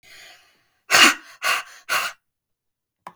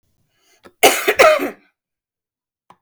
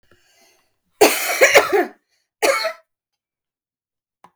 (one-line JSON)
{"exhalation_length": "3.2 s", "exhalation_amplitude": 32768, "exhalation_signal_mean_std_ratio": 0.33, "cough_length": "2.8 s", "cough_amplitude": 32768, "cough_signal_mean_std_ratio": 0.34, "three_cough_length": "4.4 s", "three_cough_amplitude": 32768, "three_cough_signal_mean_std_ratio": 0.36, "survey_phase": "beta (2021-08-13 to 2022-03-07)", "age": "18-44", "gender": "Female", "wearing_mask": "No", "symptom_none": true, "smoker_status": "Current smoker (e-cigarettes or vapes only)", "respiratory_condition_asthma": false, "respiratory_condition_other": false, "recruitment_source": "REACT", "submission_delay": "2 days", "covid_test_result": "Negative", "covid_test_method": "RT-qPCR", "influenza_a_test_result": "Negative", "influenza_b_test_result": "Negative"}